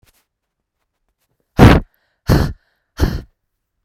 {"exhalation_length": "3.8 s", "exhalation_amplitude": 32768, "exhalation_signal_mean_std_ratio": 0.29, "survey_phase": "beta (2021-08-13 to 2022-03-07)", "age": "18-44", "gender": "Female", "wearing_mask": "No", "symptom_runny_or_blocked_nose": true, "symptom_sore_throat": true, "symptom_headache": true, "symptom_onset": "4 days", "smoker_status": "Ex-smoker", "respiratory_condition_asthma": false, "respiratory_condition_other": false, "recruitment_source": "Test and Trace", "submission_delay": "2 days", "covid_test_result": "Positive", "covid_test_method": "RT-qPCR", "covid_ct_value": 28.9, "covid_ct_gene": "N gene"}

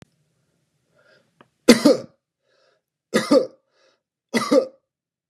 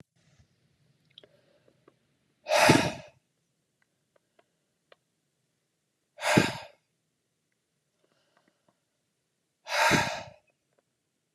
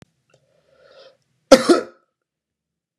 {"three_cough_length": "5.3 s", "three_cough_amplitude": 32767, "three_cough_signal_mean_std_ratio": 0.28, "exhalation_length": "11.3 s", "exhalation_amplitude": 17263, "exhalation_signal_mean_std_ratio": 0.25, "cough_length": "3.0 s", "cough_amplitude": 32768, "cough_signal_mean_std_ratio": 0.2, "survey_phase": "beta (2021-08-13 to 2022-03-07)", "age": "45-64", "gender": "Male", "wearing_mask": "No", "symptom_none": true, "smoker_status": "Never smoked", "respiratory_condition_asthma": false, "respiratory_condition_other": false, "recruitment_source": "REACT", "submission_delay": "1 day", "covid_test_result": "Negative", "covid_test_method": "RT-qPCR", "influenza_a_test_result": "Negative", "influenza_b_test_result": "Negative"}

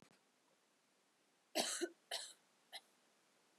{"three_cough_length": "3.6 s", "three_cough_amplitude": 1945, "three_cough_signal_mean_std_ratio": 0.32, "survey_phase": "beta (2021-08-13 to 2022-03-07)", "age": "18-44", "gender": "Female", "wearing_mask": "No", "symptom_cough_any": true, "symptom_onset": "5 days", "smoker_status": "Never smoked", "respiratory_condition_asthma": true, "respiratory_condition_other": false, "recruitment_source": "Test and Trace", "submission_delay": "1 day", "covid_test_result": "Positive", "covid_test_method": "RT-qPCR", "covid_ct_value": 21.7, "covid_ct_gene": "ORF1ab gene", "covid_ct_mean": 22.0, "covid_viral_load": "61000 copies/ml", "covid_viral_load_category": "Low viral load (10K-1M copies/ml)"}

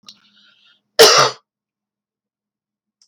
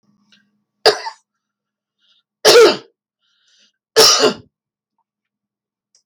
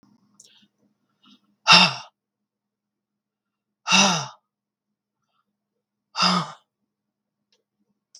{"cough_length": "3.1 s", "cough_amplitude": 32768, "cough_signal_mean_std_ratio": 0.26, "three_cough_length": "6.1 s", "three_cough_amplitude": 32768, "three_cough_signal_mean_std_ratio": 0.3, "exhalation_length": "8.2 s", "exhalation_amplitude": 32768, "exhalation_signal_mean_std_ratio": 0.24, "survey_phase": "beta (2021-08-13 to 2022-03-07)", "age": "45-64", "gender": "Female", "wearing_mask": "No", "symptom_none": true, "smoker_status": "Never smoked", "respiratory_condition_asthma": true, "respiratory_condition_other": false, "recruitment_source": "REACT", "submission_delay": "1 day", "covid_test_result": "Negative", "covid_test_method": "RT-qPCR"}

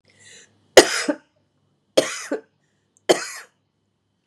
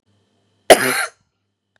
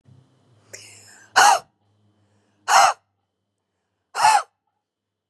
{"three_cough_length": "4.3 s", "three_cough_amplitude": 32768, "three_cough_signal_mean_std_ratio": 0.24, "cough_length": "1.8 s", "cough_amplitude": 32768, "cough_signal_mean_std_ratio": 0.27, "exhalation_length": "5.3 s", "exhalation_amplitude": 28438, "exhalation_signal_mean_std_ratio": 0.3, "survey_phase": "beta (2021-08-13 to 2022-03-07)", "age": "45-64", "gender": "Female", "wearing_mask": "No", "symptom_cough_any": true, "symptom_new_continuous_cough": true, "symptom_runny_or_blocked_nose": true, "symptom_sore_throat": true, "symptom_abdominal_pain": true, "symptom_fatigue": true, "symptom_fever_high_temperature": true, "symptom_headache": true, "symptom_onset": "2 days", "smoker_status": "Never smoked", "respiratory_condition_asthma": false, "respiratory_condition_other": true, "recruitment_source": "Test and Trace", "submission_delay": "1 day", "covid_test_result": "Positive", "covid_test_method": "RT-qPCR", "covid_ct_value": 20.8, "covid_ct_gene": "N gene"}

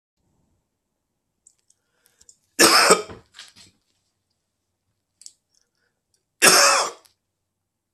{"cough_length": "7.9 s", "cough_amplitude": 32768, "cough_signal_mean_std_ratio": 0.26, "survey_phase": "beta (2021-08-13 to 2022-03-07)", "age": "45-64", "gender": "Male", "wearing_mask": "No", "symptom_none": true, "smoker_status": "Current smoker (1 to 10 cigarettes per day)", "respiratory_condition_asthma": false, "respiratory_condition_other": false, "recruitment_source": "REACT", "submission_delay": "2 days", "covid_test_result": "Negative", "covid_test_method": "RT-qPCR", "influenza_a_test_result": "Negative", "influenza_b_test_result": "Negative"}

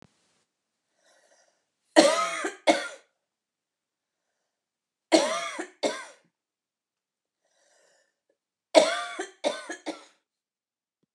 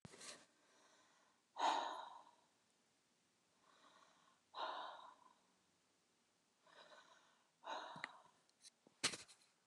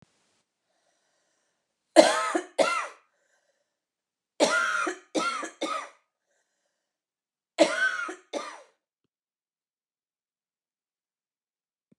{"three_cough_length": "11.1 s", "three_cough_amplitude": 28371, "three_cough_signal_mean_std_ratio": 0.27, "exhalation_length": "9.7 s", "exhalation_amplitude": 1682, "exhalation_signal_mean_std_ratio": 0.33, "cough_length": "12.0 s", "cough_amplitude": 29100, "cough_signal_mean_std_ratio": 0.3, "survey_phase": "beta (2021-08-13 to 2022-03-07)", "age": "45-64", "gender": "Female", "wearing_mask": "No", "symptom_shortness_of_breath": true, "symptom_fatigue": true, "symptom_headache": true, "symptom_loss_of_taste": true, "smoker_status": "Never smoked", "respiratory_condition_asthma": false, "respiratory_condition_other": false, "recruitment_source": "Test and Trace", "submission_delay": "2 days", "covid_test_result": "Negative", "covid_test_method": "RT-qPCR"}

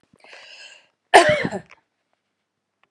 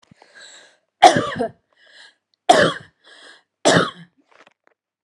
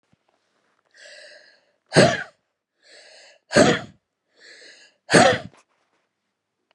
{"cough_length": "2.9 s", "cough_amplitude": 32768, "cough_signal_mean_std_ratio": 0.26, "three_cough_length": "5.0 s", "three_cough_amplitude": 32768, "three_cough_signal_mean_std_ratio": 0.3, "exhalation_length": "6.7 s", "exhalation_amplitude": 32025, "exhalation_signal_mean_std_ratio": 0.27, "survey_phase": "alpha (2021-03-01 to 2021-08-12)", "age": "45-64", "gender": "Female", "wearing_mask": "No", "symptom_fatigue": true, "smoker_status": "Ex-smoker", "respiratory_condition_asthma": true, "respiratory_condition_other": false, "recruitment_source": "REACT", "submission_delay": "2 days", "covid_test_result": "Negative", "covid_test_method": "RT-qPCR"}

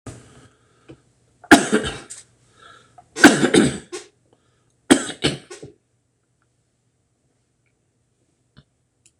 {"three_cough_length": "9.2 s", "three_cough_amplitude": 26028, "three_cough_signal_mean_std_ratio": 0.25, "survey_phase": "beta (2021-08-13 to 2022-03-07)", "age": "65+", "gender": "Male", "wearing_mask": "No", "symptom_cough_any": true, "symptom_runny_or_blocked_nose": true, "smoker_status": "Ex-smoker", "respiratory_condition_asthma": false, "respiratory_condition_other": true, "recruitment_source": "Test and Trace", "submission_delay": "1 day", "covid_test_result": "Negative", "covid_test_method": "RT-qPCR"}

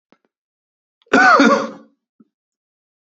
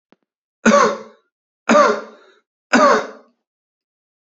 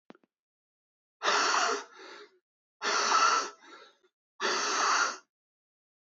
{"cough_length": "3.2 s", "cough_amplitude": 28140, "cough_signal_mean_std_ratio": 0.34, "three_cough_length": "4.3 s", "three_cough_amplitude": 31054, "three_cough_signal_mean_std_ratio": 0.39, "exhalation_length": "6.1 s", "exhalation_amplitude": 6933, "exhalation_signal_mean_std_ratio": 0.5, "survey_phase": "beta (2021-08-13 to 2022-03-07)", "age": "18-44", "gender": "Male", "wearing_mask": "No", "symptom_runny_or_blocked_nose": true, "symptom_sore_throat": true, "symptom_fatigue": true, "symptom_fever_high_temperature": true, "symptom_other": true, "symptom_onset": "3 days", "smoker_status": "Never smoked", "respiratory_condition_asthma": false, "respiratory_condition_other": false, "recruitment_source": "Test and Trace", "submission_delay": "1 day", "covid_test_result": "Positive", "covid_test_method": "ePCR"}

